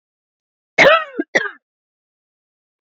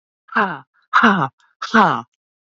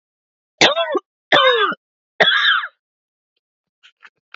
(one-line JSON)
{"cough_length": "2.8 s", "cough_amplitude": 28810, "cough_signal_mean_std_ratio": 0.29, "exhalation_length": "2.6 s", "exhalation_amplitude": 28163, "exhalation_signal_mean_std_ratio": 0.44, "three_cough_length": "4.4 s", "three_cough_amplitude": 31768, "three_cough_signal_mean_std_ratio": 0.43, "survey_phase": "beta (2021-08-13 to 2022-03-07)", "age": "45-64", "gender": "Female", "wearing_mask": "No", "symptom_none": true, "smoker_status": "Never smoked", "respiratory_condition_asthma": false, "respiratory_condition_other": false, "recruitment_source": "Test and Trace", "submission_delay": "1 day", "covid_test_result": "Negative", "covid_test_method": "LFT"}